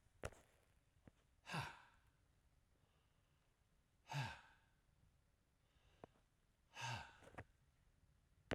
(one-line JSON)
{"exhalation_length": "8.5 s", "exhalation_amplitude": 1589, "exhalation_signal_mean_std_ratio": 0.34, "survey_phase": "alpha (2021-03-01 to 2021-08-12)", "age": "65+", "gender": "Male", "wearing_mask": "No", "symptom_none": true, "smoker_status": "Ex-smoker", "respiratory_condition_asthma": false, "respiratory_condition_other": false, "recruitment_source": "REACT", "submission_delay": "2 days", "covid_test_result": "Negative", "covid_test_method": "RT-qPCR"}